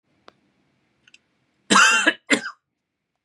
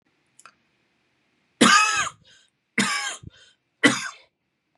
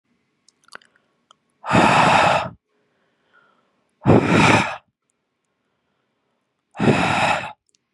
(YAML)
cough_length: 3.2 s
cough_amplitude: 27643
cough_signal_mean_std_ratio: 0.32
three_cough_length: 4.8 s
three_cough_amplitude: 24712
three_cough_signal_mean_std_ratio: 0.34
exhalation_length: 7.9 s
exhalation_amplitude: 32554
exhalation_signal_mean_std_ratio: 0.42
survey_phase: beta (2021-08-13 to 2022-03-07)
age: 18-44
gender: Male
wearing_mask: 'No'
symptom_runny_or_blocked_nose: true
symptom_onset: 4 days
smoker_status: Never smoked
respiratory_condition_asthma: false
respiratory_condition_other: false
recruitment_source: REACT
submission_delay: 1 day
covid_test_result: Negative
covid_test_method: RT-qPCR
influenza_a_test_result: Negative
influenza_b_test_result: Negative